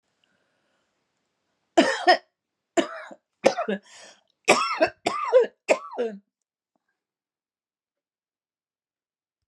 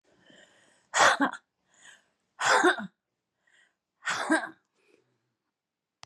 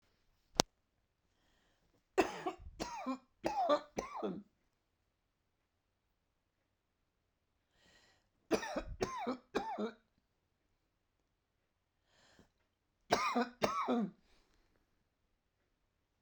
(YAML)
cough_length: 9.5 s
cough_amplitude: 29276
cough_signal_mean_std_ratio: 0.3
exhalation_length: 6.1 s
exhalation_amplitude: 16392
exhalation_signal_mean_std_ratio: 0.33
three_cough_length: 16.2 s
three_cough_amplitude: 23284
three_cough_signal_mean_std_ratio: 0.32
survey_phase: beta (2021-08-13 to 2022-03-07)
age: 65+
gender: Female
wearing_mask: 'No'
symptom_none: true
smoker_status: Never smoked
respiratory_condition_asthma: true
respiratory_condition_other: false
recruitment_source: REACT
submission_delay: 1 day
covid_test_result: Negative
covid_test_method: RT-qPCR